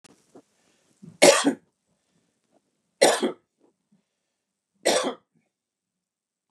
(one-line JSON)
{"three_cough_length": "6.5 s", "three_cough_amplitude": 27003, "three_cough_signal_mean_std_ratio": 0.26, "survey_phase": "beta (2021-08-13 to 2022-03-07)", "age": "45-64", "gender": "Male", "wearing_mask": "No", "symptom_none": true, "smoker_status": "Ex-smoker", "respiratory_condition_asthma": false, "respiratory_condition_other": false, "recruitment_source": "REACT", "submission_delay": "3 days", "covid_test_result": "Negative", "covid_test_method": "RT-qPCR", "influenza_a_test_result": "Negative", "influenza_b_test_result": "Negative"}